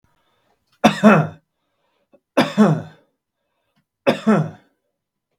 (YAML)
three_cough_length: 5.4 s
three_cough_amplitude: 32768
three_cough_signal_mean_std_ratio: 0.34
survey_phase: beta (2021-08-13 to 2022-03-07)
age: 18-44
gender: Male
wearing_mask: 'No'
symptom_none: true
smoker_status: Ex-smoker
respiratory_condition_asthma: true
respiratory_condition_other: false
recruitment_source: Test and Trace
submission_delay: 1 day
covid_test_result: Negative
covid_test_method: RT-qPCR